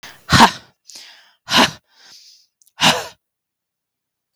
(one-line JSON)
{"exhalation_length": "4.4 s", "exhalation_amplitude": 32768, "exhalation_signal_mean_std_ratio": 0.3, "survey_phase": "beta (2021-08-13 to 2022-03-07)", "age": "18-44", "gender": "Female", "wearing_mask": "No", "symptom_fatigue": true, "symptom_onset": "13 days", "smoker_status": "Ex-smoker", "respiratory_condition_asthma": false, "respiratory_condition_other": false, "recruitment_source": "REACT", "submission_delay": "2 days", "covid_test_result": "Negative", "covid_test_method": "RT-qPCR", "influenza_a_test_result": "Negative", "influenza_b_test_result": "Negative"}